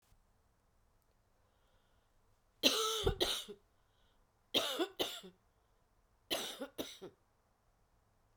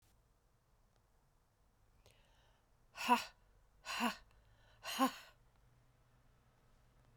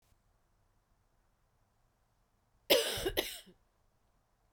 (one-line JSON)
{"three_cough_length": "8.4 s", "three_cough_amplitude": 7228, "three_cough_signal_mean_std_ratio": 0.35, "exhalation_length": "7.2 s", "exhalation_amplitude": 4022, "exhalation_signal_mean_std_ratio": 0.27, "cough_length": "4.5 s", "cough_amplitude": 9623, "cough_signal_mean_std_ratio": 0.26, "survey_phase": "beta (2021-08-13 to 2022-03-07)", "age": "45-64", "gender": "Female", "wearing_mask": "No", "symptom_cough_any": true, "symptom_new_continuous_cough": true, "symptom_runny_or_blocked_nose": true, "symptom_fatigue": true, "symptom_fever_high_temperature": true, "symptom_headache": true, "symptom_change_to_sense_of_smell_or_taste": true, "symptom_loss_of_taste": true, "symptom_onset": "3 days", "smoker_status": "Never smoked", "respiratory_condition_asthma": false, "respiratory_condition_other": true, "recruitment_source": "Test and Trace", "submission_delay": "2 days", "covid_test_result": "Positive", "covid_test_method": "RT-qPCR"}